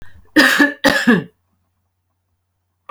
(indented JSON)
{
  "cough_length": "2.9 s",
  "cough_amplitude": 32767,
  "cough_signal_mean_std_ratio": 0.41,
  "survey_phase": "beta (2021-08-13 to 2022-03-07)",
  "age": "18-44",
  "gender": "Female",
  "wearing_mask": "No",
  "symptom_none": true,
  "smoker_status": "Ex-smoker",
  "respiratory_condition_asthma": false,
  "respiratory_condition_other": false,
  "recruitment_source": "REACT",
  "submission_delay": "3 days",
  "covid_test_result": "Negative",
  "covid_test_method": "RT-qPCR"
}